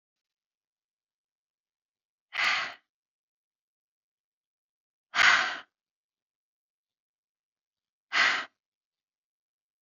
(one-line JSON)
{"exhalation_length": "9.8 s", "exhalation_amplitude": 15308, "exhalation_signal_mean_std_ratio": 0.24, "survey_phase": "alpha (2021-03-01 to 2021-08-12)", "age": "45-64", "gender": "Female", "wearing_mask": "No", "symptom_none": true, "smoker_status": "Never smoked", "respiratory_condition_asthma": false, "respiratory_condition_other": false, "recruitment_source": "REACT", "submission_delay": "7 days", "covid_test_result": "Negative", "covid_test_method": "RT-qPCR"}